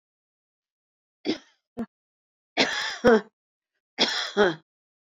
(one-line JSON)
{"three_cough_length": "5.1 s", "three_cough_amplitude": 17717, "three_cough_signal_mean_std_ratio": 0.33, "survey_phase": "beta (2021-08-13 to 2022-03-07)", "age": "65+", "gender": "Female", "wearing_mask": "No", "symptom_none": true, "smoker_status": "Ex-smoker", "respiratory_condition_asthma": false, "respiratory_condition_other": false, "recruitment_source": "REACT", "submission_delay": "1 day", "covid_test_result": "Negative", "covid_test_method": "RT-qPCR"}